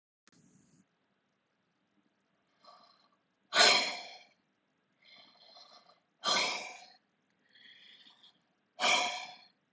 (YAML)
exhalation_length: 9.7 s
exhalation_amplitude: 10677
exhalation_signal_mean_std_ratio: 0.28
survey_phase: alpha (2021-03-01 to 2021-08-12)
age: 18-44
gender: Female
wearing_mask: 'No'
symptom_none: true
smoker_status: Never smoked
respiratory_condition_asthma: false
respiratory_condition_other: false
recruitment_source: REACT
submission_delay: 5 days
covid_test_result: Negative
covid_test_method: RT-qPCR